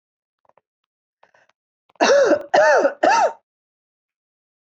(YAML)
three_cough_length: 4.8 s
three_cough_amplitude: 25668
three_cough_signal_mean_std_ratio: 0.4
survey_phase: alpha (2021-03-01 to 2021-08-12)
age: 45-64
gender: Female
wearing_mask: 'No'
symptom_none: true
smoker_status: Never smoked
respiratory_condition_asthma: true
respiratory_condition_other: false
recruitment_source: REACT
submission_delay: 2 days
covid_test_result: Negative
covid_test_method: RT-qPCR